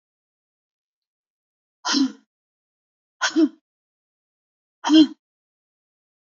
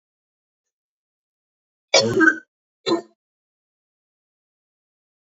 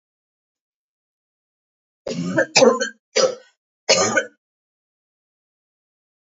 exhalation_length: 6.3 s
exhalation_amplitude: 21446
exhalation_signal_mean_std_ratio: 0.25
cough_length: 5.3 s
cough_amplitude: 28487
cough_signal_mean_std_ratio: 0.24
three_cough_length: 6.4 s
three_cough_amplitude: 31380
three_cough_signal_mean_std_ratio: 0.31
survey_phase: beta (2021-08-13 to 2022-03-07)
age: 45-64
gender: Female
wearing_mask: 'No'
symptom_cough_any: true
symptom_sore_throat: true
symptom_fatigue: true
symptom_headache: true
symptom_change_to_sense_of_smell_or_taste: true
symptom_loss_of_taste: true
symptom_onset: 3 days
smoker_status: Never smoked
respiratory_condition_asthma: false
respiratory_condition_other: false
recruitment_source: Test and Trace
submission_delay: 2 days
covid_test_result: Positive
covid_test_method: RT-qPCR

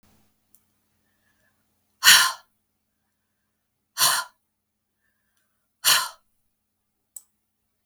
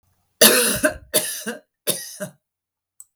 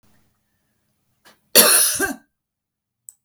exhalation_length: 7.9 s
exhalation_amplitude: 32766
exhalation_signal_mean_std_ratio: 0.22
three_cough_length: 3.2 s
three_cough_amplitude: 32768
three_cough_signal_mean_std_ratio: 0.39
cough_length: 3.2 s
cough_amplitude: 32768
cough_signal_mean_std_ratio: 0.31
survey_phase: beta (2021-08-13 to 2022-03-07)
age: 65+
gender: Female
wearing_mask: 'No'
symptom_none: true
symptom_onset: 3 days
smoker_status: Never smoked
respiratory_condition_asthma: false
respiratory_condition_other: false
recruitment_source: REACT
submission_delay: 2 days
covid_test_result: Negative
covid_test_method: RT-qPCR
influenza_a_test_result: Negative
influenza_b_test_result: Negative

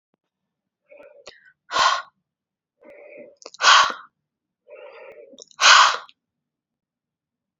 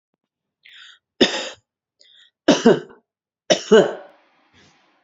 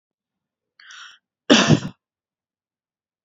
exhalation_length: 7.6 s
exhalation_amplitude: 29127
exhalation_signal_mean_std_ratio: 0.28
three_cough_length: 5.0 s
three_cough_amplitude: 28312
three_cough_signal_mean_std_ratio: 0.29
cough_length: 3.2 s
cough_amplitude: 29914
cough_signal_mean_std_ratio: 0.24
survey_phase: beta (2021-08-13 to 2022-03-07)
age: 18-44
gender: Female
wearing_mask: 'No'
symptom_none: true
smoker_status: Ex-smoker
respiratory_condition_asthma: false
respiratory_condition_other: false
recruitment_source: Test and Trace
submission_delay: 2 days
covid_test_result: Negative
covid_test_method: RT-qPCR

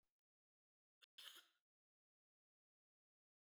cough_length: 3.5 s
cough_amplitude: 229
cough_signal_mean_std_ratio: 0.21
survey_phase: beta (2021-08-13 to 2022-03-07)
age: 45-64
gender: Female
wearing_mask: 'No'
symptom_none: true
smoker_status: Never smoked
respiratory_condition_asthma: false
respiratory_condition_other: false
recruitment_source: REACT
submission_delay: 4 days
covid_test_result: Negative
covid_test_method: RT-qPCR
influenza_a_test_result: Negative
influenza_b_test_result: Negative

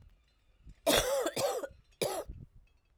cough_length: 3.0 s
cough_amplitude: 8804
cough_signal_mean_std_ratio: 0.5
survey_phase: alpha (2021-03-01 to 2021-08-12)
age: 45-64
gender: Female
wearing_mask: 'No'
symptom_cough_any: true
symptom_change_to_sense_of_smell_or_taste: true
symptom_onset: 3 days
smoker_status: Never smoked
respiratory_condition_asthma: false
respiratory_condition_other: false
recruitment_source: Test and Trace
submission_delay: 1 day
covid_test_result: Positive
covid_test_method: RT-qPCR
covid_ct_value: 23.8
covid_ct_gene: ORF1ab gene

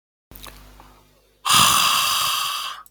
exhalation_length: 2.9 s
exhalation_amplitude: 28304
exhalation_signal_mean_std_ratio: 0.57
survey_phase: beta (2021-08-13 to 2022-03-07)
age: 45-64
gender: Female
wearing_mask: 'No'
symptom_sore_throat: true
symptom_onset: 2 days
smoker_status: Never smoked
respiratory_condition_asthma: false
respiratory_condition_other: false
recruitment_source: Test and Trace
submission_delay: 1 day
covid_test_result: Negative
covid_test_method: ePCR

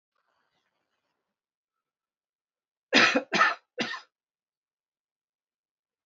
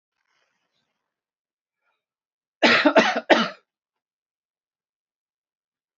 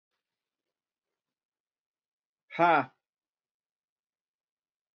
three_cough_length: 6.1 s
three_cough_amplitude: 15834
three_cough_signal_mean_std_ratio: 0.24
cough_length: 6.0 s
cough_amplitude: 26453
cough_signal_mean_std_ratio: 0.25
exhalation_length: 4.9 s
exhalation_amplitude: 11244
exhalation_signal_mean_std_ratio: 0.17
survey_phase: beta (2021-08-13 to 2022-03-07)
age: 45-64
gender: Male
wearing_mask: 'No'
symptom_cough_any: true
smoker_status: Never smoked
respiratory_condition_asthma: false
respiratory_condition_other: false
recruitment_source: REACT
submission_delay: 6 days
covid_test_result: Negative
covid_test_method: RT-qPCR
influenza_a_test_result: Negative
influenza_b_test_result: Negative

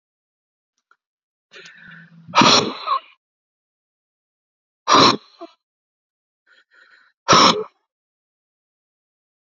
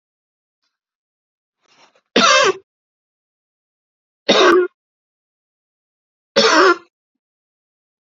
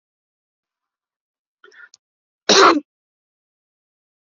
exhalation_length: 9.6 s
exhalation_amplitude: 30965
exhalation_signal_mean_std_ratio: 0.27
three_cough_length: 8.1 s
three_cough_amplitude: 31245
three_cough_signal_mean_std_ratio: 0.31
cough_length: 4.3 s
cough_amplitude: 29609
cough_signal_mean_std_ratio: 0.21
survey_phase: beta (2021-08-13 to 2022-03-07)
age: 45-64
gender: Male
wearing_mask: 'No'
symptom_headache: true
symptom_onset: 12 days
smoker_status: Ex-smoker
respiratory_condition_asthma: false
respiratory_condition_other: false
recruitment_source: REACT
submission_delay: 3 days
covid_test_result: Negative
covid_test_method: RT-qPCR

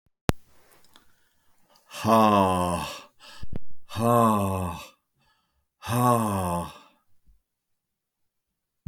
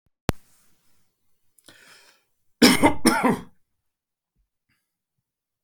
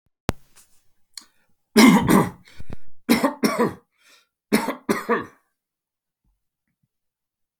exhalation_length: 8.9 s
exhalation_amplitude: 28970
exhalation_signal_mean_std_ratio: 0.49
cough_length: 5.6 s
cough_amplitude: 29421
cough_signal_mean_std_ratio: 0.29
three_cough_length: 7.6 s
three_cough_amplitude: 31234
three_cough_signal_mean_std_ratio: 0.37
survey_phase: beta (2021-08-13 to 2022-03-07)
age: 45-64
gender: Male
wearing_mask: 'No'
symptom_cough_any: true
symptom_runny_or_blocked_nose: true
symptom_sore_throat: true
symptom_onset: 3 days
smoker_status: Never smoked
respiratory_condition_asthma: false
respiratory_condition_other: false
recruitment_source: REACT
submission_delay: 1 day
covid_test_result: Positive
covid_test_method: RT-qPCR
covid_ct_value: 28.0
covid_ct_gene: E gene
influenza_a_test_result: Negative
influenza_b_test_result: Negative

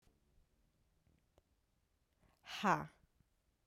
exhalation_length: 3.7 s
exhalation_amplitude: 3182
exhalation_signal_mean_std_ratio: 0.22
survey_phase: alpha (2021-03-01 to 2021-08-12)
age: 18-44
gender: Female
wearing_mask: 'No'
symptom_cough_any: true
symptom_fatigue: true
symptom_onset: 3 days
smoker_status: Ex-smoker
respiratory_condition_asthma: false
respiratory_condition_other: false
recruitment_source: Test and Trace
submission_delay: 2 days
covid_test_result: Positive
covid_test_method: RT-qPCR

